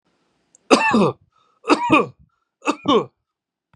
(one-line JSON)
{"three_cough_length": "3.8 s", "three_cough_amplitude": 32768, "three_cough_signal_mean_std_ratio": 0.41, "survey_phase": "beta (2021-08-13 to 2022-03-07)", "age": "45-64", "gender": "Male", "wearing_mask": "No", "symptom_none": true, "symptom_onset": "13 days", "smoker_status": "Ex-smoker", "respiratory_condition_asthma": false, "respiratory_condition_other": false, "recruitment_source": "REACT", "submission_delay": "3 days", "covid_test_result": "Negative", "covid_test_method": "RT-qPCR", "influenza_a_test_result": "Unknown/Void", "influenza_b_test_result": "Unknown/Void"}